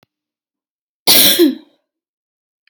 {"cough_length": "2.7 s", "cough_amplitude": 32768, "cough_signal_mean_std_ratio": 0.34, "survey_phase": "alpha (2021-03-01 to 2021-08-12)", "age": "18-44", "gender": "Female", "wearing_mask": "No", "symptom_none": true, "smoker_status": "Ex-smoker", "respiratory_condition_asthma": true, "respiratory_condition_other": false, "recruitment_source": "REACT", "submission_delay": "1 day", "covid_test_result": "Negative", "covid_test_method": "RT-qPCR"}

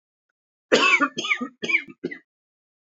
{"cough_length": "2.9 s", "cough_amplitude": 23243, "cough_signal_mean_std_ratio": 0.41, "survey_phase": "beta (2021-08-13 to 2022-03-07)", "age": "18-44", "gender": "Male", "wearing_mask": "No", "symptom_cough_any": true, "symptom_fever_high_temperature": true, "symptom_headache": true, "symptom_change_to_sense_of_smell_or_taste": true, "symptom_onset": "2 days", "smoker_status": "Never smoked", "respiratory_condition_asthma": false, "respiratory_condition_other": false, "recruitment_source": "Test and Trace", "submission_delay": "1 day", "covid_test_result": "Positive", "covid_test_method": "RT-qPCR"}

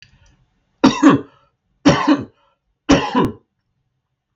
{"three_cough_length": "4.4 s", "three_cough_amplitude": 32768, "three_cough_signal_mean_std_ratio": 0.37, "survey_phase": "beta (2021-08-13 to 2022-03-07)", "age": "45-64", "gender": "Male", "wearing_mask": "No", "symptom_none": true, "smoker_status": "Never smoked", "respiratory_condition_asthma": false, "respiratory_condition_other": false, "recruitment_source": "REACT", "submission_delay": "4 days", "covid_test_result": "Negative", "covid_test_method": "RT-qPCR"}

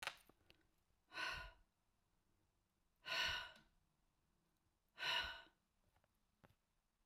{"exhalation_length": "7.1 s", "exhalation_amplitude": 1529, "exhalation_signal_mean_std_ratio": 0.34, "survey_phase": "beta (2021-08-13 to 2022-03-07)", "age": "65+", "gender": "Female", "wearing_mask": "No", "symptom_none": true, "smoker_status": "Never smoked", "respiratory_condition_asthma": false, "respiratory_condition_other": false, "recruitment_source": "REACT", "submission_delay": "1 day", "covid_test_result": "Negative", "covid_test_method": "RT-qPCR", "influenza_a_test_result": "Negative", "influenza_b_test_result": "Negative"}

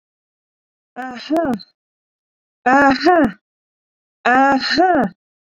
{"exhalation_length": "5.5 s", "exhalation_amplitude": 29225, "exhalation_signal_mean_std_ratio": 0.47, "survey_phase": "beta (2021-08-13 to 2022-03-07)", "age": "18-44", "gender": "Female", "wearing_mask": "No", "symptom_runny_or_blocked_nose": true, "symptom_onset": "8 days", "smoker_status": "Never smoked", "respiratory_condition_asthma": true, "respiratory_condition_other": false, "recruitment_source": "REACT", "submission_delay": "1 day", "covid_test_result": "Negative", "covid_test_method": "RT-qPCR"}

